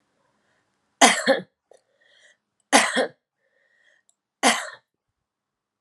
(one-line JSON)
{"three_cough_length": "5.8 s", "three_cough_amplitude": 30155, "three_cough_signal_mean_std_ratio": 0.28, "survey_phase": "alpha (2021-03-01 to 2021-08-12)", "age": "18-44", "gender": "Female", "wearing_mask": "No", "symptom_none": true, "symptom_onset": "2 days", "smoker_status": "Current smoker (1 to 10 cigarettes per day)", "respiratory_condition_asthma": false, "respiratory_condition_other": false, "recruitment_source": "Test and Trace", "submission_delay": "2 days", "covid_test_result": "Positive", "covid_test_method": "RT-qPCR", "covid_ct_value": 26.3, "covid_ct_gene": "ORF1ab gene", "covid_ct_mean": 27.1, "covid_viral_load": "1300 copies/ml", "covid_viral_load_category": "Minimal viral load (< 10K copies/ml)"}